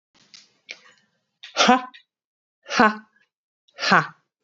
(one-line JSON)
{"exhalation_length": "4.4 s", "exhalation_amplitude": 28138, "exhalation_signal_mean_std_ratio": 0.29, "survey_phase": "beta (2021-08-13 to 2022-03-07)", "age": "45-64", "gender": "Female", "wearing_mask": "No", "symptom_none": true, "symptom_onset": "11 days", "smoker_status": "Never smoked", "respiratory_condition_asthma": false, "respiratory_condition_other": false, "recruitment_source": "REACT", "submission_delay": "3 days", "covid_test_result": "Negative", "covid_test_method": "RT-qPCR", "influenza_a_test_result": "Negative", "influenza_b_test_result": "Negative"}